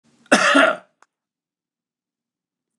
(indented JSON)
{
  "cough_length": "2.8 s",
  "cough_amplitude": 29203,
  "cough_signal_mean_std_ratio": 0.31,
  "survey_phase": "beta (2021-08-13 to 2022-03-07)",
  "age": "65+",
  "gender": "Male",
  "wearing_mask": "No",
  "symptom_none": true,
  "smoker_status": "Never smoked",
  "respiratory_condition_asthma": false,
  "respiratory_condition_other": false,
  "recruitment_source": "REACT",
  "submission_delay": "3 days",
  "covid_test_result": "Negative",
  "covid_test_method": "RT-qPCR",
  "influenza_a_test_result": "Negative",
  "influenza_b_test_result": "Negative"
}